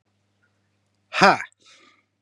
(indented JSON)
{
  "exhalation_length": "2.2 s",
  "exhalation_amplitude": 32767,
  "exhalation_signal_mean_std_ratio": 0.23,
  "survey_phase": "beta (2021-08-13 to 2022-03-07)",
  "age": "18-44",
  "gender": "Male",
  "wearing_mask": "No",
  "symptom_none": true,
  "smoker_status": "Current smoker (11 or more cigarettes per day)",
  "respiratory_condition_asthma": false,
  "respiratory_condition_other": false,
  "recruitment_source": "REACT",
  "submission_delay": "7 days",
  "covid_test_result": "Negative",
  "covid_test_method": "RT-qPCR",
  "influenza_a_test_result": "Negative",
  "influenza_b_test_result": "Negative"
}